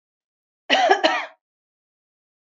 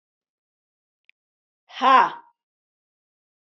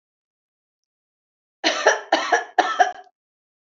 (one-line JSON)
{"cough_length": "2.6 s", "cough_amplitude": 27286, "cough_signal_mean_std_ratio": 0.34, "exhalation_length": "3.4 s", "exhalation_amplitude": 25222, "exhalation_signal_mean_std_ratio": 0.23, "three_cough_length": "3.8 s", "three_cough_amplitude": 26874, "three_cough_signal_mean_std_ratio": 0.36, "survey_phase": "beta (2021-08-13 to 2022-03-07)", "age": "45-64", "gender": "Female", "wearing_mask": "No", "symptom_runny_or_blocked_nose": true, "symptom_sore_throat": true, "symptom_fatigue": true, "symptom_headache": true, "symptom_onset": "3 days", "smoker_status": "Never smoked", "respiratory_condition_asthma": false, "respiratory_condition_other": false, "recruitment_source": "Test and Trace", "submission_delay": "2 days", "covid_test_result": "Positive", "covid_test_method": "RT-qPCR", "covid_ct_value": 18.6, "covid_ct_gene": "ORF1ab gene", "covid_ct_mean": 18.9, "covid_viral_load": "620000 copies/ml", "covid_viral_load_category": "Low viral load (10K-1M copies/ml)"}